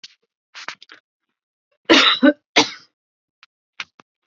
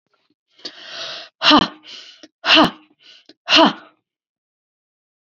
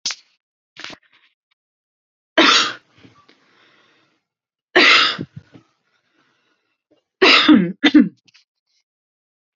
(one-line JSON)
{"cough_length": "4.3 s", "cough_amplitude": 32767, "cough_signal_mean_std_ratio": 0.28, "exhalation_length": "5.2 s", "exhalation_amplitude": 32767, "exhalation_signal_mean_std_ratio": 0.32, "three_cough_length": "9.6 s", "three_cough_amplitude": 32768, "three_cough_signal_mean_std_ratio": 0.32, "survey_phase": "alpha (2021-03-01 to 2021-08-12)", "age": "18-44", "gender": "Female", "wearing_mask": "No", "symptom_none": true, "smoker_status": "Ex-smoker", "respiratory_condition_asthma": false, "respiratory_condition_other": false, "recruitment_source": "REACT", "submission_delay": "3 days", "covid_test_result": "Negative", "covid_test_method": "RT-qPCR"}